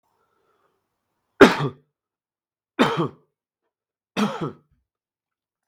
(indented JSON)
{
  "three_cough_length": "5.7 s",
  "three_cough_amplitude": 32768,
  "three_cough_signal_mean_std_ratio": 0.23,
  "survey_phase": "beta (2021-08-13 to 2022-03-07)",
  "age": "18-44",
  "gender": "Male",
  "wearing_mask": "No",
  "symptom_cough_any": true,
  "symptom_runny_or_blocked_nose": true,
  "symptom_fatigue": true,
  "symptom_headache": true,
  "smoker_status": "Never smoked",
  "respiratory_condition_asthma": false,
  "respiratory_condition_other": false,
  "recruitment_source": "Test and Trace",
  "submission_delay": "1 day",
  "covid_test_result": "Positive",
  "covid_test_method": "RT-qPCR",
  "covid_ct_value": 16.2,
  "covid_ct_gene": "N gene"
}